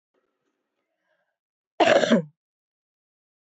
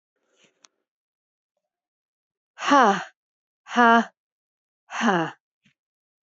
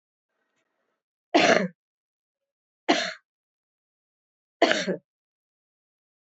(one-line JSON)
{"cough_length": "3.6 s", "cough_amplitude": 18191, "cough_signal_mean_std_ratio": 0.26, "exhalation_length": "6.2 s", "exhalation_amplitude": 21675, "exhalation_signal_mean_std_ratio": 0.27, "three_cough_length": "6.2 s", "three_cough_amplitude": 22495, "three_cough_signal_mean_std_ratio": 0.26, "survey_phase": "beta (2021-08-13 to 2022-03-07)", "age": "45-64", "gender": "Female", "wearing_mask": "No", "symptom_cough_any": true, "symptom_runny_or_blocked_nose": true, "symptom_sore_throat": true, "smoker_status": "Never smoked", "respiratory_condition_asthma": false, "respiratory_condition_other": false, "recruitment_source": "Test and Trace", "submission_delay": "2 days", "covid_test_result": "Positive", "covid_test_method": "RT-qPCR", "covid_ct_value": 18.7, "covid_ct_gene": "ORF1ab gene", "covid_ct_mean": 19.6, "covid_viral_load": "360000 copies/ml", "covid_viral_load_category": "Low viral load (10K-1M copies/ml)"}